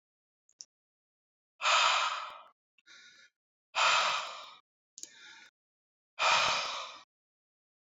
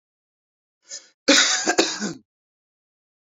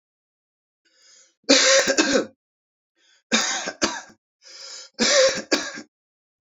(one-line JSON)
{"exhalation_length": "7.9 s", "exhalation_amplitude": 7320, "exhalation_signal_mean_std_ratio": 0.4, "cough_length": "3.3 s", "cough_amplitude": 25402, "cough_signal_mean_std_ratio": 0.35, "three_cough_length": "6.6 s", "three_cough_amplitude": 27574, "three_cough_signal_mean_std_ratio": 0.42, "survey_phase": "beta (2021-08-13 to 2022-03-07)", "age": "18-44", "gender": "Male", "wearing_mask": "No", "symptom_none": true, "smoker_status": "Never smoked", "respiratory_condition_asthma": false, "respiratory_condition_other": false, "recruitment_source": "REACT", "submission_delay": "2 days", "covid_test_result": "Negative", "covid_test_method": "RT-qPCR"}